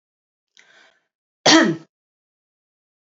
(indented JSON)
{
  "cough_length": "3.1 s",
  "cough_amplitude": 32768,
  "cough_signal_mean_std_ratio": 0.24,
  "survey_phase": "alpha (2021-03-01 to 2021-08-12)",
  "age": "45-64",
  "gender": "Female",
  "wearing_mask": "No",
  "symptom_fatigue": true,
  "symptom_fever_high_temperature": true,
  "symptom_headache": true,
  "symptom_change_to_sense_of_smell_or_taste": true,
  "symptom_onset": "3 days",
  "smoker_status": "Never smoked",
  "respiratory_condition_asthma": false,
  "respiratory_condition_other": false,
  "recruitment_source": "Test and Trace",
  "submission_delay": "2 days",
  "covid_test_result": "Positive",
  "covid_test_method": "RT-qPCR",
  "covid_ct_value": 18.1,
  "covid_ct_gene": "ORF1ab gene",
  "covid_ct_mean": 18.1,
  "covid_viral_load": "1100000 copies/ml",
  "covid_viral_load_category": "High viral load (>1M copies/ml)"
}